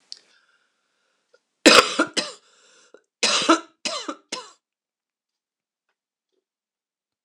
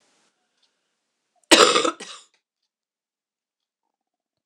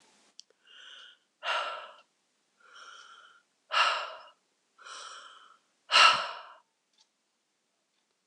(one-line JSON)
{"three_cough_length": "7.2 s", "three_cough_amplitude": 26028, "three_cough_signal_mean_std_ratio": 0.25, "cough_length": "4.5 s", "cough_amplitude": 26028, "cough_signal_mean_std_ratio": 0.21, "exhalation_length": "8.3 s", "exhalation_amplitude": 14014, "exhalation_signal_mean_std_ratio": 0.28, "survey_phase": "alpha (2021-03-01 to 2021-08-12)", "age": "45-64", "gender": "Female", "wearing_mask": "No", "symptom_cough_any": true, "symptom_shortness_of_breath": true, "symptom_fatigue": true, "symptom_headache": true, "symptom_onset": "2 days", "smoker_status": "Never smoked", "respiratory_condition_asthma": false, "respiratory_condition_other": false, "recruitment_source": "Test and Trace", "submission_delay": "2 days", "covid_test_result": "Positive", "covid_test_method": "RT-qPCR", "covid_ct_value": 15.2, "covid_ct_gene": "N gene", "covid_ct_mean": 15.3, "covid_viral_load": "9400000 copies/ml", "covid_viral_load_category": "High viral load (>1M copies/ml)"}